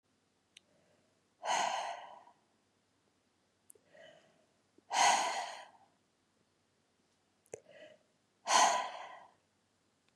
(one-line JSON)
{"exhalation_length": "10.2 s", "exhalation_amplitude": 7267, "exhalation_signal_mean_std_ratio": 0.31, "survey_phase": "beta (2021-08-13 to 2022-03-07)", "age": "18-44", "gender": "Female", "wearing_mask": "No", "symptom_cough_any": true, "symptom_runny_or_blocked_nose": true, "symptom_other": true, "smoker_status": "Never smoked", "respiratory_condition_asthma": false, "respiratory_condition_other": false, "recruitment_source": "Test and Trace", "submission_delay": "1 day", "covid_test_result": "Positive", "covid_test_method": "ePCR"}